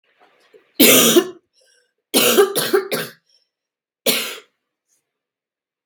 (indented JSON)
{
  "three_cough_length": "5.9 s",
  "three_cough_amplitude": 32768,
  "three_cough_signal_mean_std_ratio": 0.39,
  "survey_phase": "beta (2021-08-13 to 2022-03-07)",
  "age": "18-44",
  "gender": "Female",
  "wearing_mask": "No",
  "symptom_cough_any": true,
  "symptom_runny_or_blocked_nose": true,
  "symptom_diarrhoea": true,
  "symptom_onset": "3 days",
  "smoker_status": "Never smoked",
  "respiratory_condition_asthma": false,
  "respiratory_condition_other": false,
  "recruitment_source": "Test and Trace",
  "submission_delay": "1 day",
  "covid_test_result": "Positive",
  "covid_test_method": "RT-qPCR",
  "covid_ct_value": 22.5,
  "covid_ct_gene": "ORF1ab gene"
}